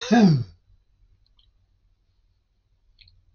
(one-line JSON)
{"cough_length": "3.3 s", "cough_amplitude": 16875, "cough_signal_mean_std_ratio": 0.28, "survey_phase": "beta (2021-08-13 to 2022-03-07)", "age": "65+", "gender": "Male", "wearing_mask": "No", "symptom_cough_any": true, "smoker_status": "Ex-smoker", "respiratory_condition_asthma": true, "respiratory_condition_other": false, "recruitment_source": "REACT", "submission_delay": "4 days", "covid_test_result": "Negative", "covid_test_method": "RT-qPCR", "influenza_a_test_result": "Negative", "influenza_b_test_result": "Negative"}